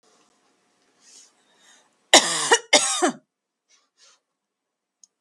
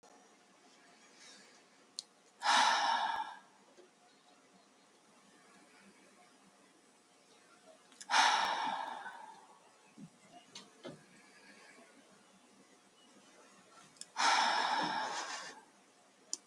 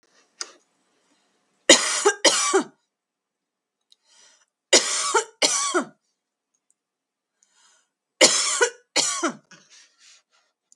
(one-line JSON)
{"cough_length": "5.2 s", "cough_amplitude": 32768, "cough_signal_mean_std_ratio": 0.26, "exhalation_length": "16.5 s", "exhalation_amplitude": 5687, "exhalation_signal_mean_std_ratio": 0.38, "three_cough_length": "10.8 s", "three_cough_amplitude": 32768, "three_cough_signal_mean_std_ratio": 0.34, "survey_phase": "beta (2021-08-13 to 2022-03-07)", "age": "18-44", "gender": "Female", "wearing_mask": "No", "symptom_cough_any": true, "symptom_sore_throat": true, "smoker_status": "Never smoked", "respiratory_condition_asthma": false, "respiratory_condition_other": false, "recruitment_source": "Test and Trace", "submission_delay": "2 days", "covid_test_result": "Positive", "covid_test_method": "LFT"}